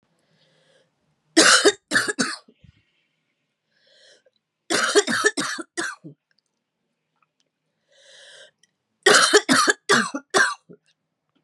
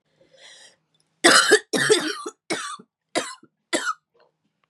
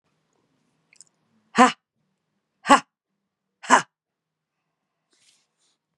{"three_cough_length": "11.4 s", "three_cough_amplitude": 29699, "three_cough_signal_mean_std_ratio": 0.35, "cough_length": "4.7 s", "cough_amplitude": 30899, "cough_signal_mean_std_ratio": 0.38, "exhalation_length": "6.0 s", "exhalation_amplitude": 32767, "exhalation_signal_mean_std_ratio": 0.18, "survey_phase": "beta (2021-08-13 to 2022-03-07)", "age": "45-64", "gender": "Female", "wearing_mask": "Yes", "symptom_sore_throat": true, "symptom_onset": "4 days", "smoker_status": "Prefer not to say", "respiratory_condition_asthma": false, "respiratory_condition_other": false, "recruitment_source": "Test and Trace", "submission_delay": "2 days", "covid_test_result": "Positive", "covid_test_method": "RT-qPCR", "covid_ct_value": 12.0, "covid_ct_gene": "ORF1ab gene"}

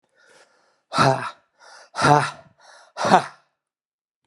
{"exhalation_length": "4.3 s", "exhalation_amplitude": 32389, "exhalation_signal_mean_std_ratio": 0.33, "survey_phase": "alpha (2021-03-01 to 2021-08-12)", "age": "45-64", "gender": "Male", "wearing_mask": "No", "symptom_new_continuous_cough": true, "symptom_abdominal_pain": true, "symptom_fatigue": true, "symptom_fever_high_temperature": true, "symptom_headache": true, "symptom_onset": "3 days", "smoker_status": "Ex-smoker", "respiratory_condition_asthma": false, "respiratory_condition_other": false, "recruitment_source": "Test and Trace", "submission_delay": "2 days", "covid_test_result": "Positive", "covid_test_method": "RT-qPCR", "covid_ct_value": 14.8, "covid_ct_gene": "ORF1ab gene", "covid_ct_mean": 15.1, "covid_viral_load": "11000000 copies/ml", "covid_viral_load_category": "High viral load (>1M copies/ml)"}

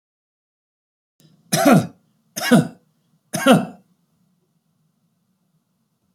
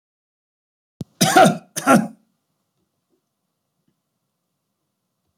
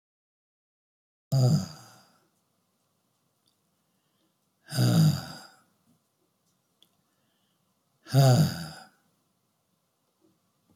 {"three_cough_length": "6.1 s", "three_cough_amplitude": 28221, "three_cough_signal_mean_std_ratio": 0.28, "cough_length": "5.4 s", "cough_amplitude": 30464, "cough_signal_mean_std_ratio": 0.25, "exhalation_length": "10.8 s", "exhalation_amplitude": 10669, "exhalation_signal_mean_std_ratio": 0.29, "survey_phase": "alpha (2021-03-01 to 2021-08-12)", "age": "65+", "gender": "Male", "wearing_mask": "No", "symptom_none": true, "smoker_status": "Never smoked", "respiratory_condition_asthma": false, "respiratory_condition_other": false, "recruitment_source": "REACT", "submission_delay": "1 day", "covid_test_result": "Negative", "covid_test_method": "RT-qPCR"}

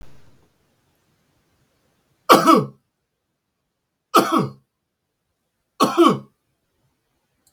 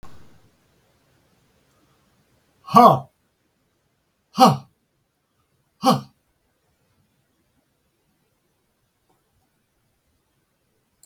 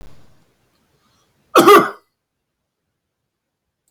{"three_cough_length": "7.5 s", "three_cough_amplitude": 32768, "three_cough_signal_mean_std_ratio": 0.28, "exhalation_length": "11.1 s", "exhalation_amplitude": 32768, "exhalation_signal_mean_std_ratio": 0.18, "cough_length": "3.9 s", "cough_amplitude": 32768, "cough_signal_mean_std_ratio": 0.24, "survey_phase": "beta (2021-08-13 to 2022-03-07)", "age": "65+", "gender": "Male", "wearing_mask": "No", "symptom_other": true, "smoker_status": "Never smoked", "respiratory_condition_asthma": false, "respiratory_condition_other": false, "recruitment_source": "REACT", "submission_delay": "1 day", "covid_test_result": "Negative", "covid_test_method": "RT-qPCR", "influenza_a_test_result": "Negative", "influenza_b_test_result": "Negative"}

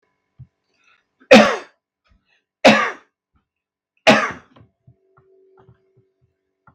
{"three_cough_length": "6.7 s", "three_cough_amplitude": 32768, "three_cough_signal_mean_std_ratio": 0.25, "survey_phase": "beta (2021-08-13 to 2022-03-07)", "age": "45-64", "gender": "Male", "wearing_mask": "No", "symptom_none": true, "smoker_status": "Ex-smoker", "respiratory_condition_asthma": false, "respiratory_condition_other": false, "recruitment_source": "REACT", "submission_delay": "1 day", "covid_test_result": "Negative", "covid_test_method": "RT-qPCR", "influenza_a_test_result": "Unknown/Void", "influenza_b_test_result": "Unknown/Void"}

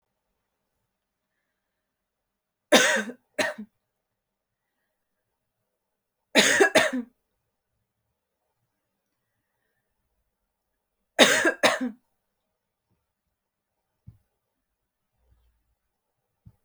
{"three_cough_length": "16.6 s", "three_cough_amplitude": 29808, "three_cough_signal_mean_std_ratio": 0.23, "survey_phase": "alpha (2021-03-01 to 2021-08-12)", "age": "18-44", "gender": "Female", "wearing_mask": "No", "symptom_cough_any": true, "symptom_shortness_of_breath": true, "symptom_fatigue": true, "symptom_fever_high_temperature": true, "symptom_headache": true, "symptom_onset": "3 days", "smoker_status": "Never smoked", "respiratory_condition_asthma": false, "respiratory_condition_other": false, "recruitment_source": "Test and Trace", "submission_delay": "2 days", "covid_test_result": "Positive", "covid_test_method": "RT-qPCR"}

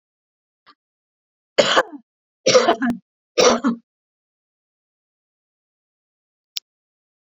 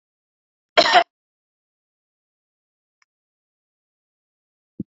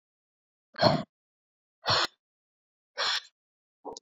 {"three_cough_length": "7.3 s", "three_cough_amplitude": 28755, "three_cough_signal_mean_std_ratio": 0.29, "cough_length": "4.9 s", "cough_amplitude": 31569, "cough_signal_mean_std_ratio": 0.17, "exhalation_length": "4.0 s", "exhalation_amplitude": 13119, "exhalation_signal_mean_std_ratio": 0.31, "survey_phase": "beta (2021-08-13 to 2022-03-07)", "age": "18-44", "gender": "Female", "wearing_mask": "No", "symptom_fever_high_temperature": true, "symptom_headache": true, "smoker_status": "Current smoker (e-cigarettes or vapes only)", "respiratory_condition_asthma": false, "respiratory_condition_other": false, "recruitment_source": "Test and Trace", "submission_delay": "2 days", "covid_test_result": "Positive", "covid_test_method": "RT-qPCR", "covid_ct_value": 35.0, "covid_ct_gene": "ORF1ab gene"}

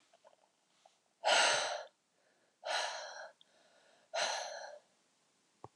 {"exhalation_length": "5.8 s", "exhalation_amplitude": 5116, "exhalation_signal_mean_std_ratio": 0.39, "survey_phase": "beta (2021-08-13 to 2022-03-07)", "age": "45-64", "gender": "Female", "wearing_mask": "No", "symptom_none": true, "smoker_status": "Never smoked", "respiratory_condition_asthma": false, "respiratory_condition_other": false, "recruitment_source": "REACT", "submission_delay": "2 days", "covid_test_result": "Negative", "covid_test_method": "RT-qPCR", "influenza_a_test_result": "Negative", "influenza_b_test_result": "Negative"}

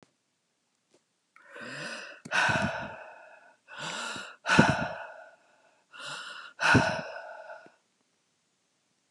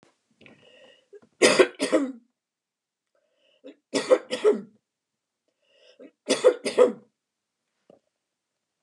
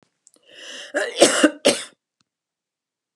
{"exhalation_length": "9.1 s", "exhalation_amplitude": 17995, "exhalation_signal_mean_std_ratio": 0.39, "three_cough_length": "8.8 s", "three_cough_amplitude": 24841, "three_cough_signal_mean_std_ratio": 0.29, "cough_length": "3.2 s", "cough_amplitude": 32616, "cough_signal_mean_std_ratio": 0.33, "survey_phase": "beta (2021-08-13 to 2022-03-07)", "age": "65+", "gender": "Female", "wearing_mask": "No", "symptom_none": true, "smoker_status": "Never smoked", "respiratory_condition_asthma": false, "respiratory_condition_other": false, "recruitment_source": "REACT", "submission_delay": "2 days", "covid_test_result": "Negative", "covid_test_method": "RT-qPCR"}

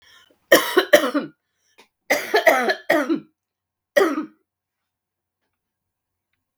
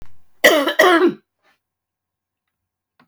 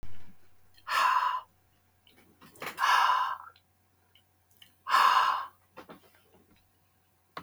{"three_cough_length": "6.6 s", "three_cough_amplitude": 32768, "three_cough_signal_mean_std_ratio": 0.36, "cough_length": "3.1 s", "cough_amplitude": 32768, "cough_signal_mean_std_ratio": 0.38, "exhalation_length": "7.4 s", "exhalation_amplitude": 8363, "exhalation_signal_mean_std_ratio": 0.45, "survey_phase": "beta (2021-08-13 to 2022-03-07)", "age": "65+", "gender": "Female", "wearing_mask": "No", "symptom_cough_any": true, "symptom_runny_or_blocked_nose": true, "symptom_other": true, "smoker_status": "Never smoked", "respiratory_condition_asthma": true, "respiratory_condition_other": false, "recruitment_source": "Test and Trace", "submission_delay": "1 day", "covid_test_result": "Positive", "covid_test_method": "LFT"}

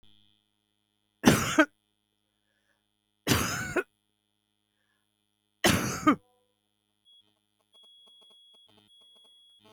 {"three_cough_length": "9.7 s", "three_cough_amplitude": 25883, "three_cough_signal_mean_std_ratio": 0.26, "survey_phase": "beta (2021-08-13 to 2022-03-07)", "age": "65+", "gender": "Female", "wearing_mask": "No", "symptom_none": true, "smoker_status": "Never smoked", "respiratory_condition_asthma": false, "respiratory_condition_other": false, "recruitment_source": "REACT", "submission_delay": "2 days", "covid_test_result": "Negative", "covid_test_method": "RT-qPCR", "influenza_a_test_result": "Unknown/Void", "influenza_b_test_result": "Unknown/Void"}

